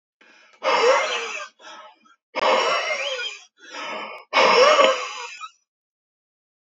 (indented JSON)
{
  "exhalation_length": "6.7 s",
  "exhalation_amplitude": 25357,
  "exhalation_signal_mean_std_ratio": 0.52,
  "survey_phase": "beta (2021-08-13 to 2022-03-07)",
  "age": "45-64",
  "gender": "Male",
  "wearing_mask": "No",
  "symptom_none": true,
  "smoker_status": "Ex-smoker",
  "respiratory_condition_asthma": false,
  "respiratory_condition_other": false,
  "recruitment_source": "REACT",
  "submission_delay": "1 day",
  "covid_test_result": "Negative",
  "covid_test_method": "RT-qPCR",
  "influenza_a_test_result": "Negative",
  "influenza_b_test_result": "Negative"
}